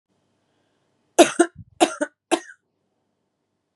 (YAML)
three_cough_length: 3.8 s
three_cough_amplitude: 32767
three_cough_signal_mean_std_ratio: 0.22
survey_phase: beta (2021-08-13 to 2022-03-07)
age: 18-44
gender: Female
wearing_mask: 'No'
symptom_none: true
symptom_onset: 12 days
smoker_status: Never smoked
respiratory_condition_asthma: false
respiratory_condition_other: false
recruitment_source: REACT
submission_delay: 1 day
covid_test_result: Negative
covid_test_method: RT-qPCR
influenza_a_test_result: Negative
influenza_b_test_result: Negative